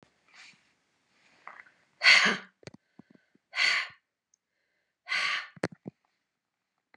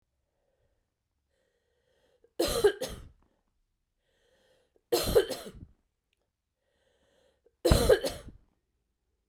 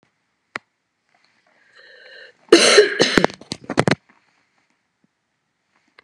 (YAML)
exhalation_length: 7.0 s
exhalation_amplitude: 16334
exhalation_signal_mean_std_ratio: 0.28
three_cough_length: 9.3 s
three_cough_amplitude: 15412
three_cough_signal_mean_std_ratio: 0.27
cough_length: 6.0 s
cough_amplitude: 32768
cough_signal_mean_std_ratio: 0.27
survey_phase: beta (2021-08-13 to 2022-03-07)
age: 45-64
gender: Female
wearing_mask: 'No'
symptom_cough_any: true
symptom_runny_or_blocked_nose: true
symptom_sore_throat: true
symptom_fever_high_temperature: true
symptom_headache: true
symptom_change_to_sense_of_smell_or_taste: true
symptom_onset: 4 days
smoker_status: Never smoked
respiratory_condition_asthma: false
respiratory_condition_other: false
recruitment_source: Test and Trace
submission_delay: 2 days
covid_test_result: Positive
covid_test_method: RT-qPCR
covid_ct_value: 14.1
covid_ct_gene: ORF1ab gene
covid_ct_mean: 14.5
covid_viral_load: 18000000 copies/ml
covid_viral_load_category: High viral load (>1M copies/ml)